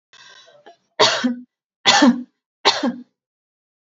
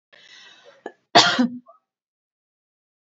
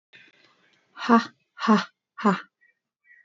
{"three_cough_length": "3.9 s", "three_cough_amplitude": 32768, "three_cough_signal_mean_std_ratio": 0.38, "cough_length": "3.2 s", "cough_amplitude": 29321, "cough_signal_mean_std_ratio": 0.26, "exhalation_length": "3.2 s", "exhalation_amplitude": 23044, "exhalation_signal_mean_std_ratio": 0.31, "survey_phase": "beta (2021-08-13 to 2022-03-07)", "age": "18-44", "gender": "Female", "wearing_mask": "No", "symptom_none": true, "smoker_status": "Ex-smoker", "respiratory_condition_asthma": false, "respiratory_condition_other": false, "recruitment_source": "REACT", "submission_delay": "1 day", "covid_test_result": "Negative", "covid_test_method": "RT-qPCR", "influenza_a_test_result": "Unknown/Void", "influenza_b_test_result": "Unknown/Void"}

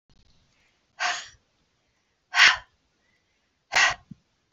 {"exhalation_length": "4.5 s", "exhalation_amplitude": 23383, "exhalation_signal_mean_std_ratio": 0.27, "survey_phase": "alpha (2021-03-01 to 2021-08-12)", "age": "18-44", "gender": "Female", "wearing_mask": "No", "symptom_shortness_of_breath": true, "symptom_headache": true, "smoker_status": "Ex-smoker", "respiratory_condition_asthma": false, "respiratory_condition_other": false, "recruitment_source": "REACT", "submission_delay": "1 day", "covid_test_result": "Negative", "covid_test_method": "RT-qPCR"}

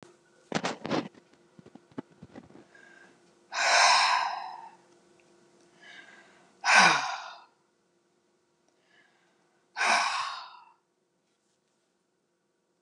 {"exhalation_length": "12.8 s", "exhalation_amplitude": 16674, "exhalation_signal_mean_std_ratio": 0.34, "survey_phase": "beta (2021-08-13 to 2022-03-07)", "age": "65+", "gender": "Female", "wearing_mask": "No", "symptom_none": true, "symptom_onset": "13 days", "smoker_status": "Never smoked", "respiratory_condition_asthma": false, "respiratory_condition_other": false, "recruitment_source": "REACT", "submission_delay": "3 days", "covid_test_result": "Negative", "covid_test_method": "RT-qPCR", "influenza_a_test_result": "Negative", "influenza_b_test_result": "Negative"}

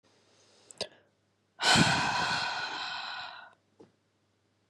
{"exhalation_length": "4.7 s", "exhalation_amplitude": 9361, "exhalation_signal_mean_std_ratio": 0.45, "survey_phase": "beta (2021-08-13 to 2022-03-07)", "age": "18-44", "gender": "Female", "wearing_mask": "No", "symptom_cough_any": true, "symptom_new_continuous_cough": true, "symptom_fatigue": true, "symptom_headache": true, "symptom_onset": "3 days", "smoker_status": "Never smoked", "respiratory_condition_asthma": false, "respiratory_condition_other": false, "recruitment_source": "Test and Trace", "submission_delay": "1 day", "covid_test_result": "Positive", "covid_test_method": "RT-qPCR", "covid_ct_value": 22.5, "covid_ct_gene": "N gene"}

